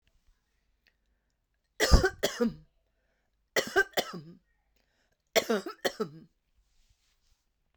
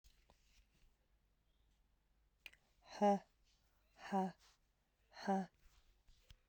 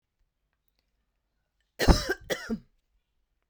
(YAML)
three_cough_length: 7.8 s
three_cough_amplitude: 17595
three_cough_signal_mean_std_ratio: 0.27
exhalation_length: 6.5 s
exhalation_amplitude: 1747
exhalation_signal_mean_std_ratio: 0.28
cough_length: 3.5 s
cough_amplitude: 19221
cough_signal_mean_std_ratio: 0.23
survey_phase: beta (2021-08-13 to 2022-03-07)
age: 18-44
gender: Female
wearing_mask: 'No'
symptom_none: true
smoker_status: Never smoked
respiratory_condition_asthma: false
respiratory_condition_other: false
recruitment_source: REACT
submission_delay: 2 days
covid_test_result: Negative
covid_test_method: RT-qPCR